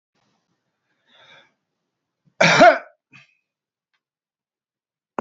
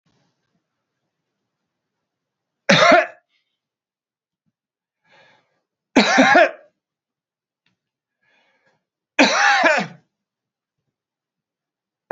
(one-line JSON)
{"cough_length": "5.2 s", "cough_amplitude": 27645, "cough_signal_mean_std_ratio": 0.21, "three_cough_length": "12.1 s", "three_cough_amplitude": 32768, "three_cough_signal_mean_std_ratio": 0.28, "survey_phase": "beta (2021-08-13 to 2022-03-07)", "age": "45-64", "gender": "Male", "wearing_mask": "No", "symptom_none": true, "smoker_status": "Ex-smoker", "respiratory_condition_asthma": false, "respiratory_condition_other": false, "recruitment_source": "REACT", "submission_delay": "1 day", "covid_test_result": "Negative", "covid_test_method": "RT-qPCR", "influenza_a_test_result": "Unknown/Void", "influenza_b_test_result": "Unknown/Void"}